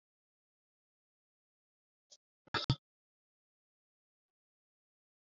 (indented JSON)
{
  "cough_length": "5.2 s",
  "cough_amplitude": 4624,
  "cough_signal_mean_std_ratio": 0.12,
  "survey_phase": "beta (2021-08-13 to 2022-03-07)",
  "age": "65+",
  "gender": "Male",
  "wearing_mask": "No",
  "symptom_none": true,
  "smoker_status": "Never smoked",
  "respiratory_condition_asthma": true,
  "respiratory_condition_other": false,
  "recruitment_source": "REACT",
  "submission_delay": "1 day",
  "covid_test_result": "Negative",
  "covid_test_method": "RT-qPCR",
  "influenza_a_test_result": "Negative",
  "influenza_b_test_result": "Negative"
}